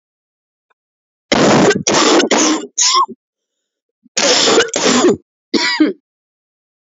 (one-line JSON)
{"cough_length": "6.9 s", "cough_amplitude": 32768, "cough_signal_mean_std_ratio": 0.57, "survey_phase": "alpha (2021-03-01 to 2021-08-12)", "age": "45-64", "gender": "Female", "wearing_mask": "No", "symptom_cough_any": true, "symptom_abdominal_pain": true, "symptom_fatigue": true, "symptom_headache": true, "symptom_onset": "3 days", "smoker_status": "Never smoked", "respiratory_condition_asthma": false, "respiratory_condition_other": false, "recruitment_source": "Test and Trace", "submission_delay": "2 days", "covid_test_result": "Positive", "covid_test_method": "RT-qPCR", "covid_ct_value": 16.1, "covid_ct_gene": "ORF1ab gene", "covid_ct_mean": 16.3, "covid_viral_load": "4400000 copies/ml", "covid_viral_load_category": "High viral load (>1M copies/ml)"}